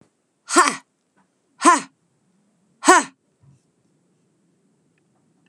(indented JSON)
{
  "exhalation_length": "5.5 s",
  "exhalation_amplitude": 32768,
  "exhalation_signal_mean_std_ratio": 0.24,
  "survey_phase": "beta (2021-08-13 to 2022-03-07)",
  "age": "45-64",
  "gender": "Female",
  "wearing_mask": "No",
  "symptom_none": true,
  "smoker_status": "Current smoker (1 to 10 cigarettes per day)",
  "respiratory_condition_asthma": false,
  "respiratory_condition_other": false,
  "recruitment_source": "REACT",
  "submission_delay": "5 days",
  "covid_test_result": "Negative",
  "covid_test_method": "RT-qPCR",
  "influenza_a_test_result": "Negative",
  "influenza_b_test_result": "Negative"
}